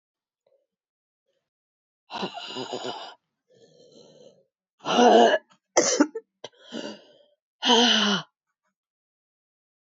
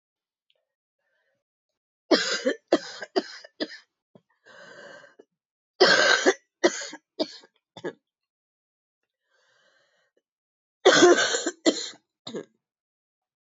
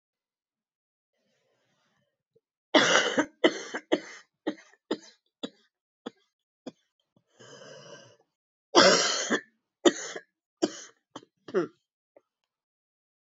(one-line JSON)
{"exhalation_length": "10.0 s", "exhalation_amplitude": 19395, "exhalation_signal_mean_std_ratio": 0.33, "three_cough_length": "13.5 s", "three_cough_amplitude": 20143, "three_cough_signal_mean_std_ratio": 0.3, "cough_length": "13.3 s", "cough_amplitude": 19919, "cough_signal_mean_std_ratio": 0.27, "survey_phase": "beta (2021-08-13 to 2022-03-07)", "age": "45-64", "gender": "Female", "wearing_mask": "No", "symptom_cough_any": true, "symptom_new_continuous_cough": true, "symptom_runny_or_blocked_nose": true, "symptom_shortness_of_breath": true, "symptom_sore_throat": true, "symptom_diarrhoea": true, "symptom_fatigue": true, "symptom_fever_high_temperature": true, "symptom_headache": true, "symptom_onset": "3 days", "smoker_status": "Never smoked", "respiratory_condition_asthma": false, "respiratory_condition_other": false, "recruitment_source": "Test and Trace", "submission_delay": "1 day", "covid_test_result": "Positive", "covid_test_method": "RT-qPCR", "covid_ct_value": 24.1, "covid_ct_gene": "ORF1ab gene", "covid_ct_mean": 24.4, "covid_viral_load": "9900 copies/ml", "covid_viral_load_category": "Minimal viral load (< 10K copies/ml)"}